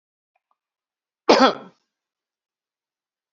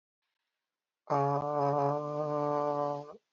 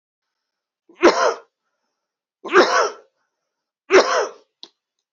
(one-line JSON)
{"cough_length": "3.3 s", "cough_amplitude": 30662, "cough_signal_mean_std_ratio": 0.2, "exhalation_length": "3.3 s", "exhalation_amplitude": 4557, "exhalation_signal_mean_std_ratio": 0.63, "three_cough_length": "5.1 s", "three_cough_amplitude": 30437, "three_cough_signal_mean_std_ratio": 0.34, "survey_phase": "beta (2021-08-13 to 2022-03-07)", "age": "45-64", "gender": "Male", "wearing_mask": "Yes", "symptom_cough_any": true, "symptom_sore_throat": true, "symptom_fatigue": true, "smoker_status": "Never smoked", "respiratory_condition_asthma": false, "respiratory_condition_other": false, "recruitment_source": "Test and Trace", "submission_delay": "1 day", "covid_test_result": "Positive", "covid_test_method": "RT-qPCR", "covid_ct_value": 20.0, "covid_ct_gene": "ORF1ab gene", "covid_ct_mean": 20.2, "covid_viral_load": "240000 copies/ml", "covid_viral_load_category": "Low viral load (10K-1M copies/ml)"}